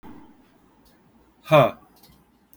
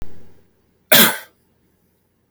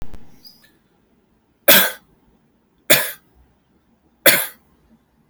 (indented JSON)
{
  "exhalation_length": "2.6 s",
  "exhalation_amplitude": 21408,
  "exhalation_signal_mean_std_ratio": 0.25,
  "cough_length": "2.3 s",
  "cough_amplitude": 32768,
  "cough_signal_mean_std_ratio": 0.32,
  "three_cough_length": "5.3 s",
  "three_cough_amplitude": 32768,
  "three_cough_signal_mean_std_ratio": 0.28,
  "survey_phase": "alpha (2021-03-01 to 2021-08-12)",
  "age": "45-64",
  "gender": "Male",
  "wearing_mask": "No",
  "symptom_cough_any": true,
  "symptom_fatigue": true,
  "symptom_change_to_sense_of_smell_or_taste": true,
  "symptom_onset": "5 days",
  "smoker_status": "Never smoked",
  "respiratory_condition_asthma": false,
  "respiratory_condition_other": false,
  "recruitment_source": "Test and Trace",
  "submission_delay": "2 days",
  "covid_test_result": "Positive",
  "covid_test_method": "RT-qPCR",
  "covid_ct_value": 29.3,
  "covid_ct_gene": "N gene"
}